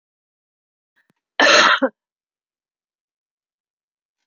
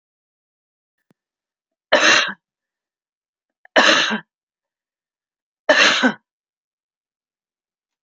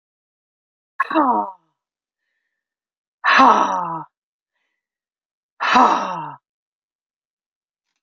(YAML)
cough_length: 4.3 s
cough_amplitude: 28760
cough_signal_mean_std_ratio: 0.26
three_cough_length: 8.0 s
three_cough_amplitude: 32768
three_cough_signal_mean_std_ratio: 0.3
exhalation_length: 8.0 s
exhalation_amplitude: 30499
exhalation_signal_mean_std_ratio: 0.34
survey_phase: alpha (2021-03-01 to 2021-08-12)
age: 65+
gender: Female
wearing_mask: 'No'
symptom_none: true
smoker_status: Ex-smoker
respiratory_condition_asthma: false
respiratory_condition_other: false
recruitment_source: REACT
submission_delay: 3 days
covid_test_result: Negative
covid_test_method: RT-qPCR